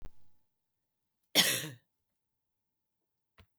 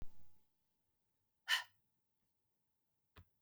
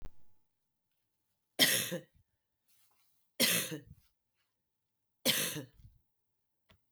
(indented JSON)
{
  "cough_length": "3.6 s",
  "cough_amplitude": 9697,
  "cough_signal_mean_std_ratio": 0.25,
  "exhalation_length": "3.4 s",
  "exhalation_amplitude": 2676,
  "exhalation_signal_mean_std_ratio": 0.28,
  "three_cough_length": "6.9 s",
  "three_cough_amplitude": 8285,
  "three_cough_signal_mean_std_ratio": 0.31,
  "survey_phase": "beta (2021-08-13 to 2022-03-07)",
  "age": "45-64",
  "gender": "Female",
  "wearing_mask": "No",
  "symptom_cough_any": true,
  "symptom_runny_or_blocked_nose": true,
  "symptom_sore_throat": true,
  "symptom_fatigue": true,
  "symptom_headache": true,
  "symptom_onset": "2 days",
  "smoker_status": "Never smoked",
  "respiratory_condition_asthma": false,
  "respiratory_condition_other": false,
  "recruitment_source": "Test and Trace",
  "submission_delay": "0 days",
  "covid_test_method": "RT-qPCR"
}